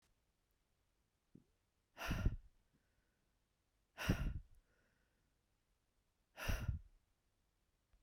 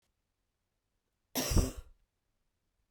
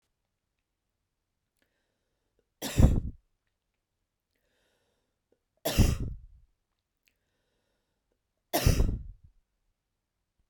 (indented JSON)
{
  "exhalation_length": "8.0 s",
  "exhalation_amplitude": 2462,
  "exhalation_signal_mean_std_ratio": 0.3,
  "cough_length": "2.9 s",
  "cough_amplitude": 6425,
  "cough_signal_mean_std_ratio": 0.25,
  "three_cough_length": "10.5 s",
  "three_cough_amplitude": 18122,
  "three_cough_signal_mean_std_ratio": 0.24,
  "survey_phase": "beta (2021-08-13 to 2022-03-07)",
  "age": "45-64",
  "gender": "Female",
  "wearing_mask": "No",
  "symptom_none": true,
  "smoker_status": "Never smoked",
  "respiratory_condition_asthma": false,
  "respiratory_condition_other": false,
  "recruitment_source": "REACT",
  "submission_delay": "1 day",
  "covid_test_result": "Negative",
  "covid_test_method": "RT-qPCR",
  "influenza_a_test_result": "Negative",
  "influenza_b_test_result": "Negative"
}